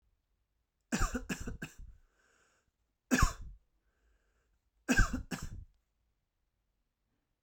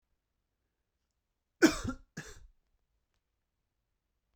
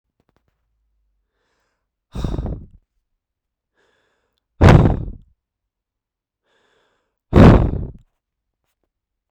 {"three_cough_length": "7.4 s", "three_cough_amplitude": 7101, "three_cough_signal_mean_std_ratio": 0.29, "cough_length": "4.4 s", "cough_amplitude": 10249, "cough_signal_mean_std_ratio": 0.17, "exhalation_length": "9.3 s", "exhalation_amplitude": 32768, "exhalation_signal_mean_std_ratio": 0.25, "survey_phase": "beta (2021-08-13 to 2022-03-07)", "age": "18-44", "gender": "Male", "wearing_mask": "No", "symptom_none": true, "smoker_status": "Never smoked", "respiratory_condition_asthma": true, "respiratory_condition_other": false, "recruitment_source": "REACT", "submission_delay": "2 days", "covid_test_result": "Negative", "covid_test_method": "RT-qPCR", "influenza_a_test_result": "Unknown/Void", "influenza_b_test_result": "Unknown/Void"}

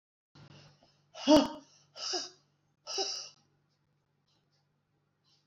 {"exhalation_length": "5.5 s", "exhalation_amplitude": 11378, "exhalation_signal_mean_std_ratio": 0.25, "survey_phase": "beta (2021-08-13 to 2022-03-07)", "age": "65+", "gender": "Female", "wearing_mask": "No", "symptom_none": true, "smoker_status": "Never smoked", "respiratory_condition_asthma": false, "respiratory_condition_other": false, "recruitment_source": "REACT", "submission_delay": "2 days", "covid_test_result": "Negative", "covid_test_method": "RT-qPCR", "influenza_a_test_result": "Negative", "influenza_b_test_result": "Negative"}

